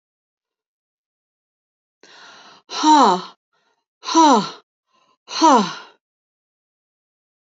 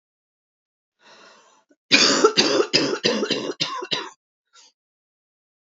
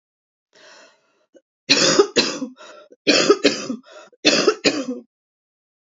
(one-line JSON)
{"exhalation_length": "7.4 s", "exhalation_amplitude": 27539, "exhalation_signal_mean_std_ratio": 0.32, "cough_length": "5.6 s", "cough_amplitude": 30877, "cough_signal_mean_std_ratio": 0.42, "three_cough_length": "5.9 s", "three_cough_amplitude": 32768, "three_cough_signal_mean_std_ratio": 0.42, "survey_phase": "alpha (2021-03-01 to 2021-08-12)", "age": "45-64", "gender": "Female", "wearing_mask": "No", "symptom_cough_any": true, "symptom_shortness_of_breath": true, "symptom_fatigue": true, "symptom_onset": "8 days", "smoker_status": "Never smoked", "respiratory_condition_asthma": true, "respiratory_condition_other": true, "recruitment_source": "REACT", "submission_delay": "2 days", "covid_test_result": "Negative", "covid_test_method": "RT-qPCR"}